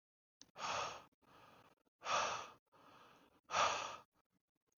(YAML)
exhalation_length: 4.8 s
exhalation_amplitude: 2552
exhalation_signal_mean_std_ratio: 0.41
survey_phase: beta (2021-08-13 to 2022-03-07)
age: 18-44
gender: Male
wearing_mask: 'No'
symptom_cough_any: true
symptom_sore_throat: true
symptom_headache: true
smoker_status: Ex-smoker
respiratory_condition_asthma: false
respiratory_condition_other: false
recruitment_source: Test and Trace
submission_delay: 2 days
covid_test_result: Positive
covid_test_method: RT-qPCR
covid_ct_value: 20.9
covid_ct_gene: N gene